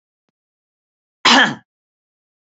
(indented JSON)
{
  "cough_length": "2.5 s",
  "cough_amplitude": 32686,
  "cough_signal_mean_std_ratio": 0.26,
  "survey_phase": "alpha (2021-03-01 to 2021-08-12)",
  "age": "45-64",
  "gender": "Female",
  "wearing_mask": "No",
  "symptom_none": true,
  "smoker_status": "Never smoked",
  "respiratory_condition_asthma": false,
  "respiratory_condition_other": false,
  "recruitment_source": "REACT",
  "submission_delay": "2 days",
  "covid_test_result": "Negative",
  "covid_test_method": "RT-qPCR"
}